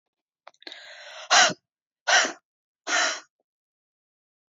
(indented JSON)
{
  "exhalation_length": "4.5 s",
  "exhalation_amplitude": 18190,
  "exhalation_signal_mean_std_ratio": 0.32,
  "survey_phase": "beta (2021-08-13 to 2022-03-07)",
  "age": "18-44",
  "gender": "Female",
  "wearing_mask": "No",
  "symptom_cough_any": true,
  "symptom_new_continuous_cough": true,
  "symptom_shortness_of_breath": true,
  "symptom_sore_throat": true,
  "symptom_fatigue": true,
  "symptom_headache": true,
  "symptom_onset": "3 days",
  "smoker_status": "Never smoked",
  "respiratory_condition_asthma": false,
  "respiratory_condition_other": false,
  "recruitment_source": "Test and Trace",
  "submission_delay": "2 days",
  "covid_test_result": "Positive",
  "covid_test_method": "RT-qPCR",
  "covid_ct_value": 26.6,
  "covid_ct_gene": "ORF1ab gene"
}